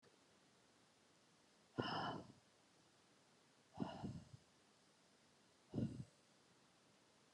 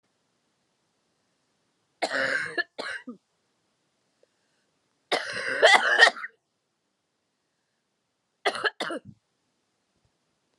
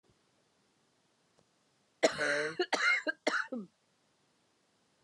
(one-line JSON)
{"exhalation_length": "7.3 s", "exhalation_amplitude": 1466, "exhalation_signal_mean_std_ratio": 0.38, "three_cough_length": "10.6 s", "three_cough_amplitude": 25752, "three_cough_signal_mean_std_ratio": 0.28, "cough_length": "5.0 s", "cough_amplitude": 8394, "cough_signal_mean_std_ratio": 0.37, "survey_phase": "alpha (2021-03-01 to 2021-08-12)", "age": "18-44", "gender": "Female", "wearing_mask": "No", "symptom_new_continuous_cough": true, "symptom_fatigue": true, "symptom_fever_high_temperature": true, "symptom_headache": true, "symptom_loss_of_taste": true, "symptom_onset": "2 days", "smoker_status": "Never smoked", "respiratory_condition_asthma": false, "respiratory_condition_other": false, "recruitment_source": "Test and Trace", "submission_delay": "1 day", "covid_test_result": "Positive", "covid_test_method": "RT-qPCR", "covid_ct_value": 34.5, "covid_ct_gene": "N gene"}